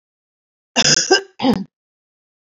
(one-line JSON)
{"cough_length": "2.6 s", "cough_amplitude": 30758, "cough_signal_mean_std_ratio": 0.37, "survey_phase": "beta (2021-08-13 to 2022-03-07)", "age": "45-64", "gender": "Female", "wearing_mask": "No", "symptom_abdominal_pain": true, "symptom_headache": true, "symptom_onset": "11 days", "smoker_status": "Current smoker (e-cigarettes or vapes only)", "respiratory_condition_asthma": false, "respiratory_condition_other": false, "recruitment_source": "REACT", "submission_delay": "1 day", "covid_test_result": "Negative", "covid_test_method": "RT-qPCR", "influenza_a_test_result": "Unknown/Void", "influenza_b_test_result": "Unknown/Void"}